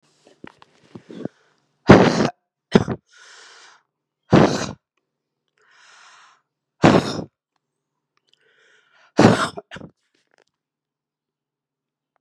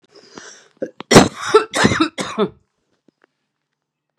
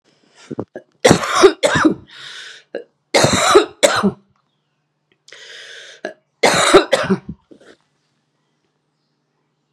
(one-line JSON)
{"exhalation_length": "12.2 s", "exhalation_amplitude": 32768, "exhalation_signal_mean_std_ratio": 0.25, "cough_length": "4.2 s", "cough_amplitude": 32768, "cough_signal_mean_std_ratio": 0.33, "three_cough_length": "9.7 s", "three_cough_amplitude": 32768, "three_cough_signal_mean_std_ratio": 0.38, "survey_phase": "beta (2021-08-13 to 2022-03-07)", "age": "18-44", "gender": "Female", "wearing_mask": "No", "symptom_cough_any": true, "symptom_runny_or_blocked_nose": true, "symptom_shortness_of_breath": true, "symptom_sore_throat": true, "symptom_headache": true, "symptom_onset": "5 days", "smoker_status": "Current smoker (11 or more cigarettes per day)", "respiratory_condition_asthma": true, "respiratory_condition_other": false, "recruitment_source": "REACT", "submission_delay": "2 days", "covid_test_result": "Negative", "covid_test_method": "RT-qPCR", "influenza_a_test_result": "Negative", "influenza_b_test_result": "Negative"}